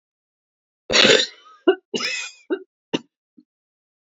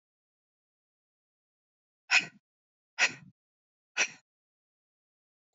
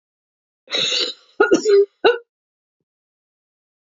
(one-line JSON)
{"cough_length": "4.1 s", "cough_amplitude": 32768, "cough_signal_mean_std_ratio": 0.32, "exhalation_length": "5.5 s", "exhalation_amplitude": 9456, "exhalation_signal_mean_std_ratio": 0.18, "three_cough_length": "3.8 s", "three_cough_amplitude": 27743, "three_cough_signal_mean_std_ratio": 0.38, "survey_phase": "beta (2021-08-13 to 2022-03-07)", "age": "45-64", "gender": "Female", "wearing_mask": "No", "symptom_cough_any": true, "symptom_runny_or_blocked_nose": true, "symptom_fatigue": true, "symptom_fever_high_temperature": true, "symptom_headache": true, "symptom_change_to_sense_of_smell_or_taste": true, "symptom_loss_of_taste": true, "symptom_onset": "3 days", "smoker_status": "Never smoked", "respiratory_condition_asthma": false, "respiratory_condition_other": false, "recruitment_source": "Test and Trace", "submission_delay": "2 days", "covid_test_result": "Positive", "covid_test_method": "RT-qPCR", "covid_ct_value": 19.3, "covid_ct_gene": "N gene"}